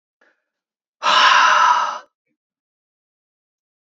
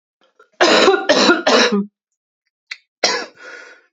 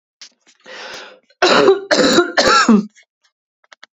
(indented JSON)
{
  "exhalation_length": "3.8 s",
  "exhalation_amplitude": 28352,
  "exhalation_signal_mean_std_ratio": 0.41,
  "cough_length": "3.9 s",
  "cough_amplitude": 30399,
  "cough_signal_mean_std_ratio": 0.5,
  "three_cough_length": "3.9 s",
  "three_cough_amplitude": 32767,
  "three_cough_signal_mean_std_ratio": 0.5,
  "survey_phase": "beta (2021-08-13 to 2022-03-07)",
  "age": "18-44",
  "gender": "Female",
  "wearing_mask": "No",
  "symptom_cough_any": true,
  "symptom_runny_or_blocked_nose": true,
  "symptom_shortness_of_breath": true,
  "symptom_fatigue": true,
  "symptom_headache": true,
  "symptom_change_to_sense_of_smell_or_taste": true,
  "smoker_status": "Never smoked",
  "respiratory_condition_asthma": true,
  "respiratory_condition_other": false,
  "recruitment_source": "Test and Trace",
  "submission_delay": "1 day",
  "covid_test_result": "Positive",
  "covid_test_method": "RT-qPCR",
  "covid_ct_value": 24.4,
  "covid_ct_gene": "ORF1ab gene"
}